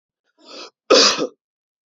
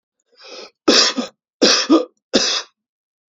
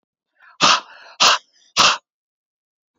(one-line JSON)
{"cough_length": "1.9 s", "cough_amplitude": 31127, "cough_signal_mean_std_ratio": 0.34, "three_cough_length": "3.3 s", "three_cough_amplitude": 31190, "three_cough_signal_mean_std_ratio": 0.44, "exhalation_length": "3.0 s", "exhalation_amplitude": 32767, "exhalation_signal_mean_std_ratio": 0.35, "survey_phase": "beta (2021-08-13 to 2022-03-07)", "age": "18-44", "gender": "Male", "wearing_mask": "No", "symptom_none": true, "smoker_status": "Ex-smoker", "respiratory_condition_asthma": false, "respiratory_condition_other": false, "recruitment_source": "REACT", "submission_delay": "1 day", "covid_test_result": "Negative", "covid_test_method": "RT-qPCR", "influenza_a_test_result": "Negative", "influenza_b_test_result": "Negative"}